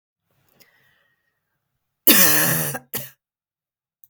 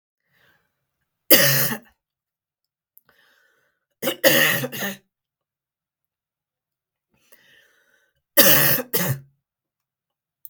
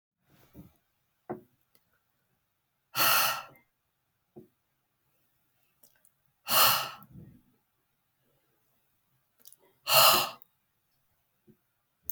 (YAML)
cough_length: 4.1 s
cough_amplitude: 32768
cough_signal_mean_std_ratio: 0.32
three_cough_length: 10.5 s
three_cough_amplitude: 32768
three_cough_signal_mean_std_ratio: 0.31
exhalation_length: 12.1 s
exhalation_amplitude: 15306
exhalation_signal_mean_std_ratio: 0.25
survey_phase: beta (2021-08-13 to 2022-03-07)
age: 45-64
gender: Female
wearing_mask: 'No'
symptom_runny_or_blocked_nose: true
symptom_sore_throat: true
symptom_fatigue: true
symptom_onset: 13 days
smoker_status: Never smoked
respiratory_condition_asthma: false
respiratory_condition_other: false
recruitment_source: REACT
submission_delay: 1 day
covid_test_result: Negative
covid_test_method: RT-qPCR
influenza_a_test_result: Negative
influenza_b_test_result: Negative